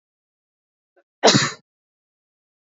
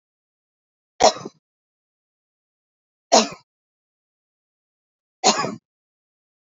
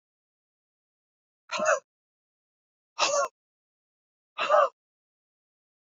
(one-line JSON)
{"cough_length": "2.6 s", "cough_amplitude": 28196, "cough_signal_mean_std_ratio": 0.23, "three_cough_length": "6.6 s", "three_cough_amplitude": 28448, "three_cough_signal_mean_std_ratio": 0.2, "exhalation_length": "5.8 s", "exhalation_amplitude": 10809, "exhalation_signal_mean_std_ratio": 0.29, "survey_phase": "beta (2021-08-13 to 2022-03-07)", "age": "18-44", "gender": "Female", "wearing_mask": "No", "symptom_none": true, "smoker_status": "Never smoked", "respiratory_condition_asthma": false, "respiratory_condition_other": false, "recruitment_source": "REACT", "submission_delay": "3 days", "covid_test_result": "Negative", "covid_test_method": "RT-qPCR"}